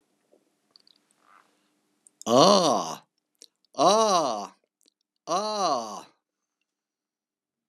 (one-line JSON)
{"exhalation_length": "7.7 s", "exhalation_amplitude": 24254, "exhalation_signal_mean_std_ratio": 0.35, "survey_phase": "beta (2021-08-13 to 2022-03-07)", "age": "65+", "gender": "Male", "wearing_mask": "No", "symptom_runny_or_blocked_nose": true, "symptom_onset": "2 days", "smoker_status": "Never smoked", "respiratory_condition_asthma": false, "respiratory_condition_other": false, "recruitment_source": "Test and Trace", "submission_delay": "1 day", "covid_test_result": "Positive", "covid_test_method": "RT-qPCR", "covid_ct_value": 25.3, "covid_ct_gene": "ORF1ab gene", "covid_ct_mean": 26.1, "covid_viral_load": "2800 copies/ml", "covid_viral_load_category": "Minimal viral load (< 10K copies/ml)"}